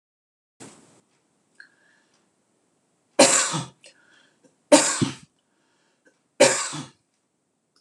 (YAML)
three_cough_length: 7.8 s
three_cough_amplitude: 26028
three_cough_signal_mean_std_ratio: 0.26
survey_phase: beta (2021-08-13 to 2022-03-07)
age: 65+
gender: Male
wearing_mask: 'No'
symptom_none: true
smoker_status: Never smoked
respiratory_condition_asthma: false
respiratory_condition_other: false
recruitment_source: REACT
submission_delay: 1 day
covid_test_result: Negative
covid_test_method: RT-qPCR